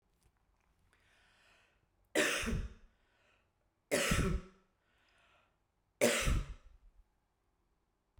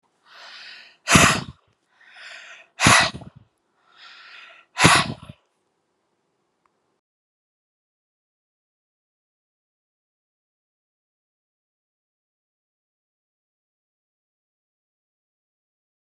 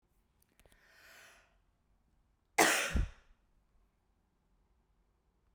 {"three_cough_length": "8.2 s", "three_cough_amplitude": 5138, "three_cough_signal_mean_std_ratio": 0.36, "exhalation_length": "16.1 s", "exhalation_amplitude": 32768, "exhalation_signal_mean_std_ratio": 0.19, "cough_length": "5.5 s", "cough_amplitude": 9252, "cough_signal_mean_std_ratio": 0.24, "survey_phase": "beta (2021-08-13 to 2022-03-07)", "age": "65+", "gender": "Female", "wearing_mask": "No", "symptom_none": true, "smoker_status": "Never smoked", "respiratory_condition_asthma": false, "respiratory_condition_other": false, "recruitment_source": "REACT", "submission_delay": "2 days", "covid_test_result": "Negative", "covid_test_method": "RT-qPCR"}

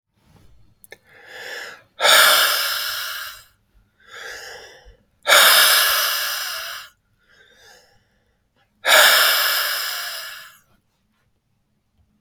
{"exhalation_length": "12.2 s", "exhalation_amplitude": 32768, "exhalation_signal_mean_std_ratio": 0.45, "survey_phase": "beta (2021-08-13 to 2022-03-07)", "age": "18-44", "gender": "Male", "wearing_mask": "No", "symptom_runny_or_blocked_nose": true, "symptom_onset": "12 days", "smoker_status": "Never smoked", "respiratory_condition_asthma": false, "respiratory_condition_other": false, "recruitment_source": "REACT", "submission_delay": "2 days", "covid_test_result": "Negative", "covid_test_method": "RT-qPCR", "influenza_a_test_result": "Negative", "influenza_b_test_result": "Negative"}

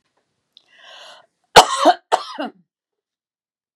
{"cough_length": "3.8 s", "cough_amplitude": 32768, "cough_signal_mean_std_ratio": 0.24, "survey_phase": "beta (2021-08-13 to 2022-03-07)", "age": "45-64", "gender": "Female", "wearing_mask": "No", "symptom_none": true, "symptom_onset": "5 days", "smoker_status": "Never smoked", "respiratory_condition_asthma": true, "respiratory_condition_other": false, "recruitment_source": "REACT", "submission_delay": "2 days", "covid_test_result": "Negative", "covid_test_method": "RT-qPCR", "influenza_a_test_result": "Negative", "influenza_b_test_result": "Negative"}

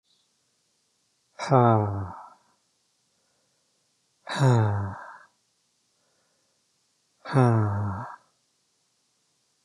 {"exhalation_length": "9.6 s", "exhalation_amplitude": 16967, "exhalation_signal_mean_std_ratio": 0.37, "survey_phase": "beta (2021-08-13 to 2022-03-07)", "age": "45-64", "gender": "Male", "wearing_mask": "No", "symptom_none": true, "smoker_status": "Never smoked", "respiratory_condition_asthma": false, "respiratory_condition_other": false, "recruitment_source": "REACT", "submission_delay": "1 day", "covid_test_result": "Negative", "covid_test_method": "RT-qPCR"}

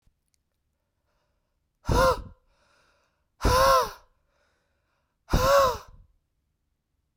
{"exhalation_length": "7.2 s", "exhalation_amplitude": 12472, "exhalation_signal_mean_std_ratio": 0.34, "survey_phase": "beta (2021-08-13 to 2022-03-07)", "age": "18-44", "gender": "Female", "wearing_mask": "No", "symptom_runny_or_blocked_nose": true, "symptom_shortness_of_breath": true, "symptom_fatigue": true, "symptom_headache": true, "symptom_change_to_sense_of_smell_or_taste": true, "symptom_loss_of_taste": true, "symptom_onset": "6 days", "smoker_status": "Never smoked", "respiratory_condition_asthma": false, "respiratory_condition_other": false, "recruitment_source": "Test and Trace", "submission_delay": "2 days", "covid_test_result": "Positive", "covid_test_method": "RT-qPCR", "covid_ct_value": 15.4, "covid_ct_gene": "ORF1ab gene", "covid_ct_mean": 16.5, "covid_viral_load": "3800000 copies/ml", "covid_viral_load_category": "High viral load (>1M copies/ml)"}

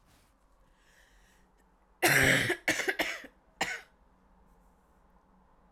{"cough_length": "5.7 s", "cough_amplitude": 9800, "cough_signal_mean_std_ratio": 0.35, "survey_phase": "alpha (2021-03-01 to 2021-08-12)", "age": "18-44", "gender": "Female", "wearing_mask": "No", "symptom_cough_any": true, "symptom_shortness_of_breath": true, "symptom_fatigue": true, "symptom_change_to_sense_of_smell_or_taste": true, "symptom_loss_of_taste": true, "symptom_onset": "7 days", "smoker_status": "Never smoked", "respiratory_condition_asthma": false, "respiratory_condition_other": false, "recruitment_source": "Test and Trace", "submission_delay": "2 days", "covid_test_result": "Positive", "covid_test_method": "RT-qPCR", "covid_ct_value": 19.0, "covid_ct_gene": "ORF1ab gene", "covid_ct_mean": 19.4, "covid_viral_load": "440000 copies/ml", "covid_viral_load_category": "Low viral load (10K-1M copies/ml)"}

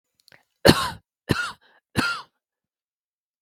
{"three_cough_length": "3.4 s", "three_cough_amplitude": 32768, "three_cough_signal_mean_std_ratio": 0.27, "survey_phase": "beta (2021-08-13 to 2022-03-07)", "age": "18-44", "gender": "Female", "wearing_mask": "No", "symptom_none": true, "symptom_onset": "11 days", "smoker_status": "Never smoked", "respiratory_condition_asthma": true, "respiratory_condition_other": false, "recruitment_source": "REACT", "submission_delay": "4 days", "covid_test_result": "Negative", "covid_test_method": "RT-qPCR", "influenza_a_test_result": "Negative", "influenza_b_test_result": "Negative"}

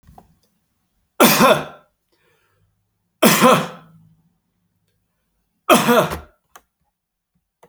{"three_cough_length": "7.7 s", "three_cough_amplitude": 32767, "three_cough_signal_mean_std_ratio": 0.32, "survey_phase": "beta (2021-08-13 to 2022-03-07)", "age": "45-64", "gender": "Male", "wearing_mask": "No", "symptom_runny_or_blocked_nose": true, "symptom_fatigue": true, "symptom_fever_high_temperature": true, "symptom_onset": "3 days", "smoker_status": "Never smoked", "respiratory_condition_asthma": false, "respiratory_condition_other": false, "recruitment_source": "Test and Trace", "submission_delay": "2 days", "covid_test_result": "Positive", "covid_test_method": "RT-qPCR"}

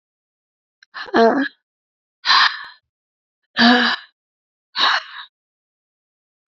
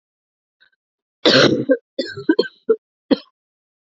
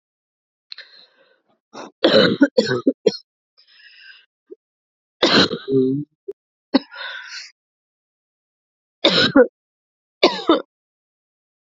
{"exhalation_length": "6.5 s", "exhalation_amplitude": 28259, "exhalation_signal_mean_std_ratio": 0.36, "cough_length": "3.8 s", "cough_amplitude": 31185, "cough_signal_mean_std_ratio": 0.35, "three_cough_length": "11.8 s", "three_cough_amplitude": 32768, "three_cough_signal_mean_std_ratio": 0.33, "survey_phase": "beta (2021-08-13 to 2022-03-07)", "age": "18-44", "gender": "Female", "wearing_mask": "No", "symptom_cough_any": true, "symptom_new_continuous_cough": true, "symptom_runny_or_blocked_nose": true, "symptom_shortness_of_breath": true, "symptom_sore_throat": true, "symptom_abdominal_pain": true, "symptom_fatigue": true, "symptom_fever_high_temperature": true, "symptom_headache": true, "smoker_status": "Never smoked", "respiratory_condition_asthma": false, "respiratory_condition_other": false, "recruitment_source": "Test and Trace", "submission_delay": "1 day", "covid_test_result": "Positive", "covid_test_method": "RT-qPCR", "covid_ct_value": 17.7, "covid_ct_gene": "ORF1ab gene", "covid_ct_mean": 17.9, "covid_viral_load": "1300000 copies/ml", "covid_viral_load_category": "High viral load (>1M copies/ml)"}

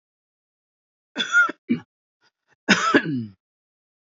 {"three_cough_length": "4.1 s", "three_cough_amplitude": 27644, "three_cough_signal_mean_std_ratio": 0.35, "survey_phase": "alpha (2021-03-01 to 2021-08-12)", "age": "45-64", "gender": "Female", "wearing_mask": "No", "symptom_none": true, "smoker_status": "Ex-smoker", "respiratory_condition_asthma": false, "respiratory_condition_other": false, "recruitment_source": "REACT", "submission_delay": "2 days", "covid_test_result": "Negative", "covid_test_method": "RT-qPCR"}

